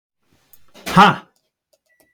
{"exhalation_length": "2.1 s", "exhalation_amplitude": 32766, "exhalation_signal_mean_std_ratio": 0.26, "survey_phase": "beta (2021-08-13 to 2022-03-07)", "age": "65+", "gender": "Male", "wearing_mask": "No", "symptom_none": true, "smoker_status": "Never smoked", "respiratory_condition_asthma": false, "respiratory_condition_other": false, "recruitment_source": "REACT", "submission_delay": "2 days", "covid_test_method": "RT-qPCR"}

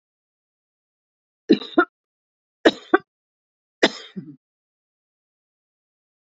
{"three_cough_length": "6.2 s", "three_cough_amplitude": 32767, "three_cough_signal_mean_std_ratio": 0.18, "survey_phase": "beta (2021-08-13 to 2022-03-07)", "age": "45-64", "gender": "Female", "wearing_mask": "No", "symptom_none": true, "symptom_onset": "8 days", "smoker_status": "Ex-smoker", "respiratory_condition_asthma": false, "respiratory_condition_other": false, "recruitment_source": "REACT", "submission_delay": "1 day", "covid_test_result": "Negative", "covid_test_method": "RT-qPCR"}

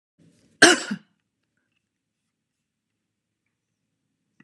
{"cough_length": "4.4 s", "cough_amplitude": 32767, "cough_signal_mean_std_ratio": 0.16, "survey_phase": "alpha (2021-03-01 to 2021-08-12)", "age": "45-64", "gender": "Female", "wearing_mask": "No", "symptom_none": true, "symptom_onset": "12 days", "smoker_status": "Never smoked", "respiratory_condition_asthma": false, "respiratory_condition_other": false, "recruitment_source": "REACT", "submission_delay": "2 days", "covid_test_result": "Negative", "covid_test_method": "RT-qPCR"}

